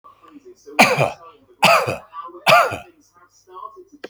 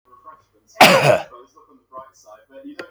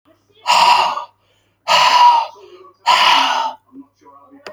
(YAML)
three_cough_length: 4.1 s
three_cough_amplitude: 31458
three_cough_signal_mean_std_ratio: 0.4
cough_length: 2.9 s
cough_amplitude: 32020
cough_signal_mean_std_ratio: 0.32
exhalation_length: 4.5 s
exhalation_amplitude: 30968
exhalation_signal_mean_std_ratio: 0.56
survey_phase: beta (2021-08-13 to 2022-03-07)
age: 65+
gender: Male
wearing_mask: 'No'
symptom_none: true
smoker_status: Ex-smoker
respiratory_condition_asthma: false
respiratory_condition_other: false
recruitment_source: REACT
submission_delay: 4 days
covid_test_result: Negative
covid_test_method: RT-qPCR
influenza_a_test_result: Negative
influenza_b_test_result: Negative